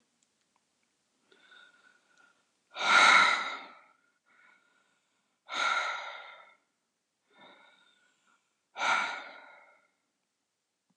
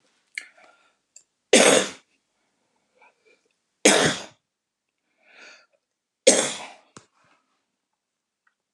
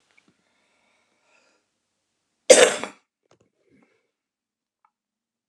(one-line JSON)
{"exhalation_length": "11.0 s", "exhalation_amplitude": 11412, "exhalation_signal_mean_std_ratio": 0.29, "three_cough_length": "8.7 s", "three_cough_amplitude": 28247, "three_cough_signal_mean_std_ratio": 0.25, "cough_length": "5.5 s", "cough_amplitude": 32768, "cough_signal_mean_std_ratio": 0.16, "survey_phase": "alpha (2021-03-01 to 2021-08-12)", "age": "65+", "gender": "Female", "wearing_mask": "No", "symptom_none": true, "smoker_status": "Current smoker (11 or more cigarettes per day)", "respiratory_condition_asthma": false, "respiratory_condition_other": false, "recruitment_source": "REACT", "submission_delay": "2 days", "covid_test_result": "Negative", "covid_test_method": "RT-qPCR"}